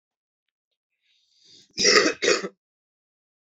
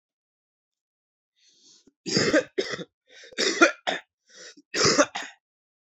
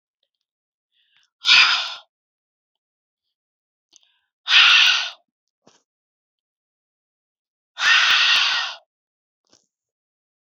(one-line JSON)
{"cough_length": "3.6 s", "cough_amplitude": 26586, "cough_signal_mean_std_ratio": 0.3, "three_cough_length": "5.8 s", "three_cough_amplitude": 24919, "three_cough_signal_mean_std_ratio": 0.36, "exhalation_length": "10.6 s", "exhalation_amplitude": 30291, "exhalation_signal_mean_std_ratio": 0.33, "survey_phase": "alpha (2021-03-01 to 2021-08-12)", "age": "18-44", "gender": "Male", "wearing_mask": "No", "symptom_cough_any": true, "smoker_status": "Never smoked", "respiratory_condition_asthma": false, "respiratory_condition_other": false, "recruitment_source": "Test and Trace", "submission_delay": "2 days", "covid_test_result": "Positive", "covid_test_method": "RT-qPCR"}